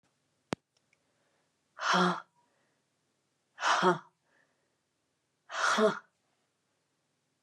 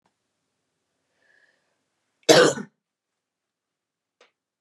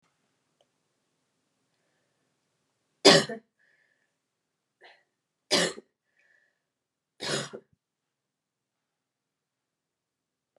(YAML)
exhalation_length: 7.4 s
exhalation_amplitude: 6951
exhalation_signal_mean_std_ratio: 0.31
cough_length: 4.6 s
cough_amplitude: 31084
cough_signal_mean_std_ratio: 0.18
three_cough_length: 10.6 s
three_cough_amplitude: 23549
three_cough_signal_mean_std_ratio: 0.16
survey_phase: beta (2021-08-13 to 2022-03-07)
age: 45-64
gender: Female
wearing_mask: 'No'
symptom_runny_or_blocked_nose: true
symptom_shortness_of_breath: true
symptom_fatigue: true
symptom_headache: true
symptom_onset: 4 days
smoker_status: Never smoked
respiratory_condition_asthma: false
respiratory_condition_other: false
recruitment_source: Test and Trace
submission_delay: 2 days
covid_test_result: Positive
covid_test_method: RT-qPCR